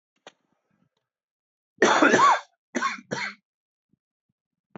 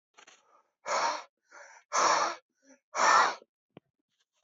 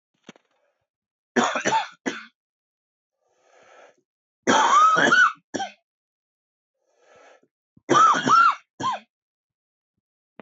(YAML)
cough_length: 4.8 s
cough_amplitude: 19507
cough_signal_mean_std_ratio: 0.34
exhalation_length: 4.4 s
exhalation_amplitude: 10165
exhalation_signal_mean_std_ratio: 0.41
three_cough_length: 10.4 s
three_cough_amplitude: 18715
three_cough_signal_mean_std_ratio: 0.38
survey_phase: beta (2021-08-13 to 2022-03-07)
age: 18-44
gender: Male
wearing_mask: 'No'
symptom_cough_any: true
symptom_runny_or_blocked_nose: true
symptom_sore_throat: true
symptom_fatigue: true
symptom_headache: true
symptom_onset: 5 days
smoker_status: Never smoked
respiratory_condition_asthma: false
respiratory_condition_other: false
recruitment_source: Test and Trace
submission_delay: 2 days
covid_test_result: Negative
covid_test_method: RT-qPCR